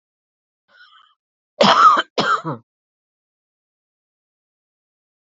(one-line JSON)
{"cough_length": "5.3 s", "cough_amplitude": 32767, "cough_signal_mean_std_ratio": 0.28, "survey_phase": "beta (2021-08-13 to 2022-03-07)", "age": "45-64", "gender": "Female", "wearing_mask": "No", "symptom_cough_any": true, "symptom_runny_or_blocked_nose": true, "symptom_sore_throat": true, "symptom_fatigue": true, "symptom_headache": true, "symptom_change_to_sense_of_smell_or_taste": true, "symptom_onset": "5 days", "smoker_status": "Never smoked", "respiratory_condition_asthma": true, "respiratory_condition_other": false, "recruitment_source": "Test and Trace", "submission_delay": "2 days", "covid_test_result": "Positive", "covid_test_method": "RT-qPCR", "covid_ct_value": 14.4, "covid_ct_gene": "ORF1ab gene"}